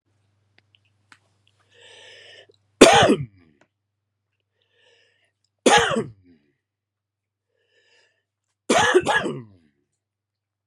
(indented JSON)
{
  "three_cough_length": "10.7 s",
  "three_cough_amplitude": 32768,
  "three_cough_signal_mean_std_ratio": 0.26,
  "survey_phase": "beta (2021-08-13 to 2022-03-07)",
  "age": "45-64",
  "gender": "Male",
  "wearing_mask": "No",
  "symptom_none": true,
  "smoker_status": "Ex-smoker",
  "respiratory_condition_asthma": false,
  "respiratory_condition_other": false,
  "recruitment_source": "REACT",
  "submission_delay": "2 days",
  "covid_test_result": "Negative",
  "covid_test_method": "RT-qPCR"
}